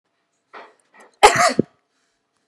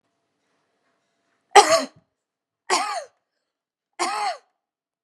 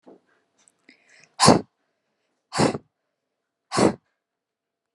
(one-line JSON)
{"cough_length": "2.5 s", "cough_amplitude": 32768, "cough_signal_mean_std_ratio": 0.26, "three_cough_length": "5.0 s", "three_cough_amplitude": 32768, "three_cough_signal_mean_std_ratio": 0.26, "exhalation_length": "4.9 s", "exhalation_amplitude": 28975, "exhalation_signal_mean_std_ratio": 0.25, "survey_phase": "beta (2021-08-13 to 2022-03-07)", "age": "18-44", "gender": "Female", "wearing_mask": "No", "symptom_runny_or_blocked_nose": true, "symptom_sore_throat": true, "symptom_fatigue": true, "symptom_headache": true, "smoker_status": "Never smoked", "respiratory_condition_asthma": false, "respiratory_condition_other": false, "recruitment_source": "Test and Trace", "submission_delay": "3 days", "covid_test_method": "RT-qPCR", "covid_ct_value": 30.4, "covid_ct_gene": "ORF1ab gene", "covid_ct_mean": 32.0, "covid_viral_load": "32 copies/ml", "covid_viral_load_category": "Minimal viral load (< 10K copies/ml)"}